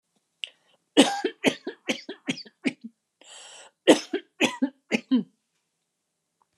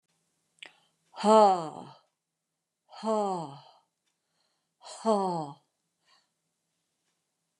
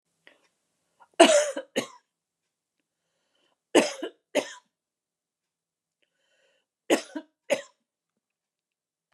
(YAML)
cough_length: 6.6 s
cough_amplitude: 27306
cough_signal_mean_std_ratio: 0.3
exhalation_length: 7.6 s
exhalation_amplitude: 12490
exhalation_signal_mean_std_ratio: 0.29
three_cough_length: 9.1 s
three_cough_amplitude: 28619
three_cough_signal_mean_std_ratio: 0.22
survey_phase: beta (2021-08-13 to 2022-03-07)
age: 65+
gender: Female
wearing_mask: 'No'
symptom_none: true
smoker_status: Never smoked
respiratory_condition_asthma: false
respiratory_condition_other: false
recruitment_source: REACT
submission_delay: 1 day
covid_test_result: Negative
covid_test_method: RT-qPCR